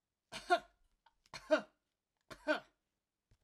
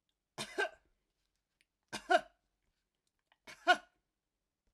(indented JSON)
{
  "three_cough_length": "3.4 s",
  "three_cough_amplitude": 3919,
  "three_cough_signal_mean_std_ratio": 0.25,
  "cough_length": "4.7 s",
  "cough_amplitude": 6843,
  "cough_signal_mean_std_ratio": 0.21,
  "survey_phase": "alpha (2021-03-01 to 2021-08-12)",
  "age": "65+",
  "gender": "Female",
  "wearing_mask": "No",
  "symptom_none": true,
  "smoker_status": "Ex-smoker",
  "respiratory_condition_asthma": false,
  "respiratory_condition_other": false,
  "recruitment_source": "REACT",
  "submission_delay": "1 day",
  "covid_test_result": "Negative",
  "covid_test_method": "RT-qPCR"
}